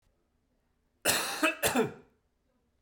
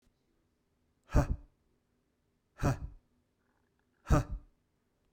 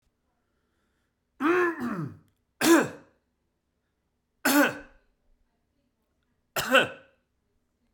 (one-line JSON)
{"cough_length": "2.8 s", "cough_amplitude": 9190, "cough_signal_mean_std_ratio": 0.4, "exhalation_length": "5.1 s", "exhalation_amplitude": 6825, "exhalation_signal_mean_std_ratio": 0.26, "three_cough_length": "7.9 s", "three_cough_amplitude": 16930, "three_cough_signal_mean_std_ratio": 0.33, "survey_phase": "beta (2021-08-13 to 2022-03-07)", "age": "45-64", "gender": "Male", "wearing_mask": "No", "symptom_cough_any": true, "symptom_runny_or_blocked_nose": true, "symptom_shortness_of_breath": true, "symptom_sore_throat": true, "symptom_fatigue": true, "symptom_headache": true, "symptom_change_to_sense_of_smell_or_taste": true, "symptom_onset": "3 days", "smoker_status": "Ex-smoker", "respiratory_condition_asthma": false, "respiratory_condition_other": false, "recruitment_source": "Test and Trace", "submission_delay": "2 days", "covid_test_result": "Positive", "covid_test_method": "RT-qPCR", "covid_ct_value": 22.1, "covid_ct_gene": "ORF1ab gene"}